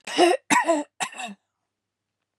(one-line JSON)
{"three_cough_length": "2.4 s", "three_cough_amplitude": 21797, "three_cough_signal_mean_std_ratio": 0.42, "survey_phase": "beta (2021-08-13 to 2022-03-07)", "age": "45-64", "gender": "Female", "wearing_mask": "No", "symptom_none": true, "smoker_status": "Never smoked", "respiratory_condition_asthma": false, "respiratory_condition_other": false, "recruitment_source": "REACT", "submission_delay": "4 days", "covid_test_result": "Negative", "covid_test_method": "RT-qPCR", "influenza_a_test_result": "Unknown/Void", "influenza_b_test_result": "Unknown/Void"}